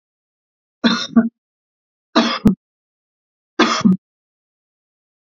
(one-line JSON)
{"three_cough_length": "5.2 s", "three_cough_amplitude": 28688, "three_cough_signal_mean_std_ratio": 0.33, "survey_phase": "beta (2021-08-13 to 2022-03-07)", "age": "45-64", "gender": "Male", "wearing_mask": "No", "symptom_none": true, "smoker_status": "Never smoked", "respiratory_condition_asthma": false, "respiratory_condition_other": false, "recruitment_source": "REACT", "submission_delay": "5 days", "covid_test_result": "Negative", "covid_test_method": "RT-qPCR", "influenza_a_test_result": "Unknown/Void", "influenza_b_test_result": "Unknown/Void"}